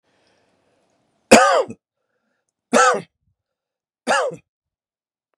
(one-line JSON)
{"three_cough_length": "5.4 s", "three_cough_amplitude": 32768, "three_cough_signal_mean_std_ratio": 0.3, "survey_phase": "beta (2021-08-13 to 2022-03-07)", "age": "45-64", "gender": "Male", "wearing_mask": "No", "symptom_none": true, "smoker_status": "Ex-smoker", "respiratory_condition_asthma": false, "respiratory_condition_other": false, "recruitment_source": "REACT", "submission_delay": "1 day", "covid_test_result": "Negative", "covid_test_method": "RT-qPCR", "influenza_a_test_result": "Negative", "influenza_b_test_result": "Negative"}